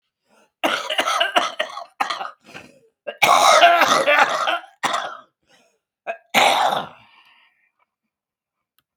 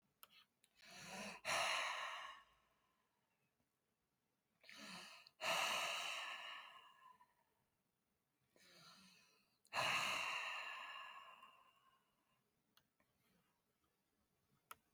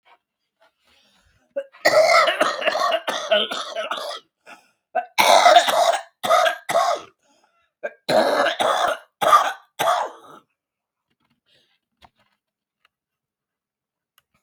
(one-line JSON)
{"cough_length": "9.0 s", "cough_amplitude": 32766, "cough_signal_mean_std_ratio": 0.47, "exhalation_length": "14.9 s", "exhalation_amplitude": 1303, "exhalation_signal_mean_std_ratio": 0.44, "three_cough_length": "14.4 s", "three_cough_amplitude": 32192, "three_cough_signal_mean_std_ratio": 0.46, "survey_phase": "beta (2021-08-13 to 2022-03-07)", "age": "65+", "gender": "Female", "wearing_mask": "No", "symptom_cough_any": true, "symptom_runny_or_blocked_nose": true, "symptom_fatigue": true, "symptom_onset": "12 days", "smoker_status": "Current smoker (11 or more cigarettes per day)", "respiratory_condition_asthma": false, "respiratory_condition_other": true, "recruitment_source": "REACT", "submission_delay": "2 days", "covid_test_result": "Negative", "covid_test_method": "RT-qPCR", "influenza_a_test_result": "Negative", "influenza_b_test_result": "Negative"}